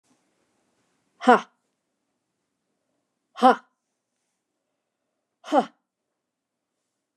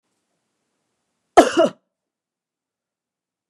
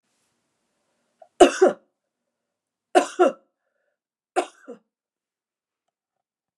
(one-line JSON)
{"exhalation_length": "7.2 s", "exhalation_amplitude": 27830, "exhalation_signal_mean_std_ratio": 0.17, "cough_length": "3.5 s", "cough_amplitude": 29204, "cough_signal_mean_std_ratio": 0.2, "three_cough_length": "6.6 s", "three_cough_amplitude": 29204, "three_cough_signal_mean_std_ratio": 0.21, "survey_phase": "beta (2021-08-13 to 2022-03-07)", "age": "45-64", "gender": "Female", "wearing_mask": "No", "symptom_none": true, "smoker_status": "Never smoked", "respiratory_condition_asthma": false, "respiratory_condition_other": false, "recruitment_source": "REACT", "submission_delay": "0 days", "covid_test_result": "Negative", "covid_test_method": "RT-qPCR", "influenza_a_test_result": "Negative", "influenza_b_test_result": "Negative"}